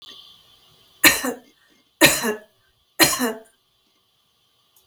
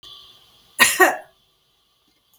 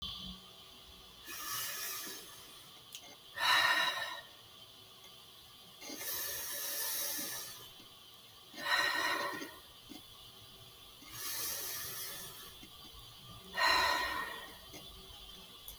{"three_cough_length": "4.9 s", "three_cough_amplitude": 32768, "three_cough_signal_mean_std_ratio": 0.31, "cough_length": "2.4 s", "cough_amplitude": 32768, "cough_signal_mean_std_ratio": 0.29, "exhalation_length": "15.8 s", "exhalation_amplitude": 5426, "exhalation_signal_mean_std_ratio": 0.6, "survey_phase": "beta (2021-08-13 to 2022-03-07)", "age": "45-64", "gender": "Female", "wearing_mask": "No", "symptom_none": true, "smoker_status": "Ex-smoker", "respiratory_condition_asthma": false, "respiratory_condition_other": false, "recruitment_source": "REACT", "submission_delay": "3 days", "covid_test_result": "Negative", "covid_test_method": "RT-qPCR", "influenza_a_test_result": "Negative", "influenza_b_test_result": "Negative"}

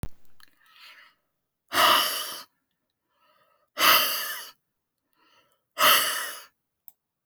{"exhalation_length": "7.3 s", "exhalation_amplitude": 19789, "exhalation_signal_mean_std_ratio": 0.38, "survey_phase": "beta (2021-08-13 to 2022-03-07)", "age": "65+", "gender": "Female", "wearing_mask": "No", "symptom_none": true, "smoker_status": "Never smoked", "respiratory_condition_asthma": false, "respiratory_condition_other": false, "recruitment_source": "REACT", "submission_delay": "1 day", "covid_test_result": "Negative", "covid_test_method": "RT-qPCR"}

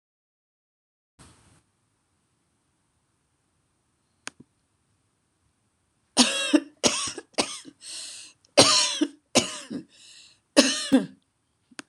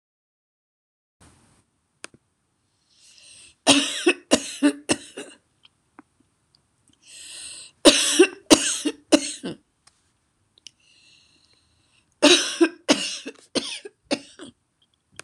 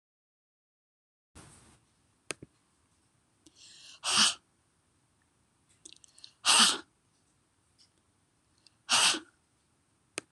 {"cough_length": "11.9 s", "cough_amplitude": 26027, "cough_signal_mean_std_ratio": 0.29, "three_cough_length": "15.2 s", "three_cough_amplitude": 26028, "three_cough_signal_mean_std_ratio": 0.29, "exhalation_length": "10.3 s", "exhalation_amplitude": 12526, "exhalation_signal_mean_std_ratio": 0.24, "survey_phase": "beta (2021-08-13 to 2022-03-07)", "age": "65+", "gender": "Female", "wearing_mask": "No", "symptom_none": true, "smoker_status": "Ex-smoker", "respiratory_condition_asthma": false, "respiratory_condition_other": false, "recruitment_source": "REACT", "submission_delay": "5 days", "covid_test_result": "Negative", "covid_test_method": "RT-qPCR", "influenza_a_test_result": "Negative", "influenza_b_test_result": "Negative"}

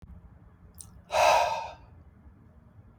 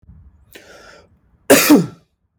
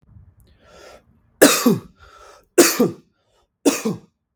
{"exhalation_length": "3.0 s", "exhalation_amplitude": 10932, "exhalation_signal_mean_std_ratio": 0.39, "cough_length": "2.4 s", "cough_amplitude": 32768, "cough_signal_mean_std_ratio": 0.33, "three_cough_length": "4.4 s", "three_cough_amplitude": 32768, "three_cough_signal_mean_std_ratio": 0.34, "survey_phase": "beta (2021-08-13 to 2022-03-07)", "age": "18-44", "gender": "Male", "wearing_mask": "No", "symptom_none": true, "smoker_status": "Ex-smoker", "respiratory_condition_asthma": false, "respiratory_condition_other": false, "recruitment_source": "REACT", "submission_delay": "2 days", "covid_test_result": "Negative", "covid_test_method": "RT-qPCR", "influenza_a_test_result": "Negative", "influenza_b_test_result": "Negative"}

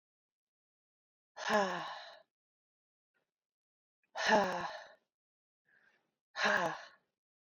{"exhalation_length": "7.6 s", "exhalation_amplitude": 5221, "exhalation_signal_mean_std_ratio": 0.33, "survey_phase": "beta (2021-08-13 to 2022-03-07)", "age": "45-64", "gender": "Female", "wearing_mask": "No", "symptom_none": true, "smoker_status": "Ex-smoker", "respiratory_condition_asthma": false, "respiratory_condition_other": false, "recruitment_source": "REACT", "submission_delay": "1 day", "covid_test_result": "Negative", "covid_test_method": "RT-qPCR"}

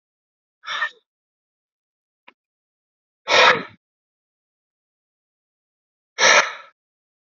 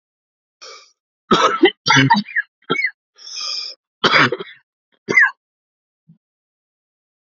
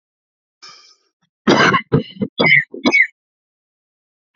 {"exhalation_length": "7.3 s", "exhalation_amplitude": 28545, "exhalation_signal_mean_std_ratio": 0.24, "three_cough_length": "7.3 s", "three_cough_amplitude": 32767, "three_cough_signal_mean_std_ratio": 0.38, "cough_length": "4.4 s", "cough_amplitude": 32767, "cough_signal_mean_std_ratio": 0.39, "survey_phase": "alpha (2021-03-01 to 2021-08-12)", "age": "18-44", "gender": "Male", "wearing_mask": "No", "symptom_fatigue": true, "smoker_status": "Ex-smoker", "respiratory_condition_asthma": true, "respiratory_condition_other": false, "recruitment_source": "Test and Trace", "submission_delay": "2 days", "covid_test_result": "Positive", "covid_test_method": "RT-qPCR", "covid_ct_value": 23.0, "covid_ct_gene": "N gene"}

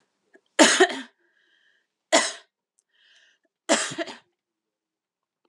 {"three_cough_length": "5.5 s", "three_cough_amplitude": 28585, "three_cough_signal_mean_std_ratio": 0.27, "survey_phase": "alpha (2021-03-01 to 2021-08-12)", "age": "45-64", "gender": "Female", "wearing_mask": "No", "symptom_cough_any": true, "symptom_fatigue": true, "symptom_headache": true, "smoker_status": "Ex-smoker", "respiratory_condition_asthma": false, "respiratory_condition_other": false, "recruitment_source": "Test and Trace", "submission_delay": "2 days", "covid_test_result": "Positive", "covid_test_method": "RT-qPCR"}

